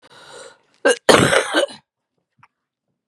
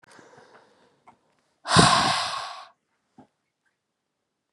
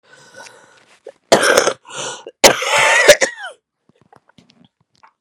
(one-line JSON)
{"cough_length": "3.1 s", "cough_amplitude": 32768, "cough_signal_mean_std_ratio": 0.35, "exhalation_length": "4.5 s", "exhalation_amplitude": 27134, "exhalation_signal_mean_std_ratio": 0.31, "three_cough_length": "5.2 s", "three_cough_amplitude": 32768, "three_cough_signal_mean_std_ratio": 0.38, "survey_phase": "beta (2021-08-13 to 2022-03-07)", "age": "18-44", "gender": "Female", "wearing_mask": "Yes", "symptom_cough_any": true, "symptom_runny_or_blocked_nose": true, "symptom_shortness_of_breath": true, "symptom_fatigue": true, "symptom_headache": true, "symptom_change_to_sense_of_smell_or_taste": true, "symptom_loss_of_taste": true, "symptom_other": true, "symptom_onset": "2 days", "smoker_status": "Ex-smoker", "respiratory_condition_asthma": true, "respiratory_condition_other": false, "recruitment_source": "Test and Trace", "submission_delay": "1 day", "covid_test_result": "Positive", "covid_test_method": "RT-qPCR", "covid_ct_value": 16.2, "covid_ct_gene": "ORF1ab gene", "covid_ct_mean": 16.3, "covid_viral_load": "4400000 copies/ml", "covid_viral_load_category": "High viral load (>1M copies/ml)"}